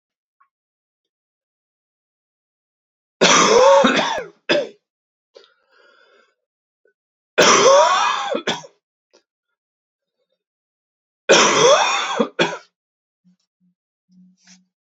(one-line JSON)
{"three_cough_length": "14.9 s", "three_cough_amplitude": 30371, "three_cough_signal_mean_std_ratio": 0.37, "survey_phase": "beta (2021-08-13 to 2022-03-07)", "age": "18-44", "gender": "Male", "wearing_mask": "No", "symptom_fatigue": true, "symptom_change_to_sense_of_smell_or_taste": true, "symptom_other": true, "smoker_status": "Never smoked", "respiratory_condition_asthma": false, "respiratory_condition_other": false, "recruitment_source": "Test and Trace", "submission_delay": "2 days", "covid_test_result": "Positive", "covid_test_method": "LAMP"}